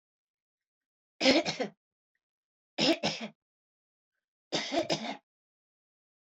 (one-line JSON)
{"three_cough_length": "6.3 s", "three_cough_amplitude": 10625, "three_cough_signal_mean_std_ratio": 0.32, "survey_phase": "alpha (2021-03-01 to 2021-08-12)", "age": "45-64", "gender": "Female", "wearing_mask": "No", "symptom_none": true, "smoker_status": "Never smoked", "respiratory_condition_asthma": false, "respiratory_condition_other": false, "recruitment_source": "REACT", "submission_delay": "2 days", "covid_test_result": "Negative", "covid_test_method": "RT-qPCR"}